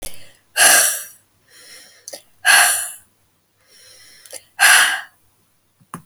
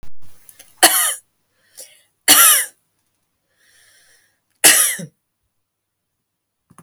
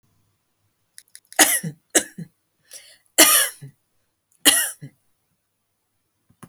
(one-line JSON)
{"exhalation_length": "6.1 s", "exhalation_amplitude": 32768, "exhalation_signal_mean_std_ratio": 0.39, "cough_length": "6.8 s", "cough_amplitude": 32768, "cough_signal_mean_std_ratio": 0.33, "three_cough_length": "6.5 s", "three_cough_amplitude": 32768, "three_cough_signal_mean_std_ratio": 0.28, "survey_phase": "alpha (2021-03-01 to 2021-08-12)", "age": "45-64", "gender": "Female", "wearing_mask": "No", "symptom_none": true, "symptom_onset": "12 days", "smoker_status": "Never smoked", "respiratory_condition_asthma": true, "respiratory_condition_other": false, "recruitment_source": "REACT", "submission_delay": "3 days", "covid_test_result": "Negative", "covid_test_method": "RT-qPCR"}